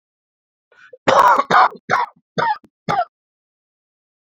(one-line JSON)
{"cough_length": "4.3 s", "cough_amplitude": 28922, "cough_signal_mean_std_ratio": 0.39, "survey_phase": "beta (2021-08-13 to 2022-03-07)", "age": "45-64", "gender": "Male", "wearing_mask": "No", "symptom_cough_any": true, "symptom_runny_or_blocked_nose": true, "symptom_sore_throat": true, "symptom_abdominal_pain": true, "symptom_fatigue": true, "symptom_fever_high_temperature": true, "symptom_headache": true, "symptom_other": true, "smoker_status": "Never smoked", "respiratory_condition_asthma": false, "respiratory_condition_other": false, "recruitment_source": "Test and Trace", "submission_delay": "1 day", "covid_test_result": "Positive", "covid_test_method": "LFT"}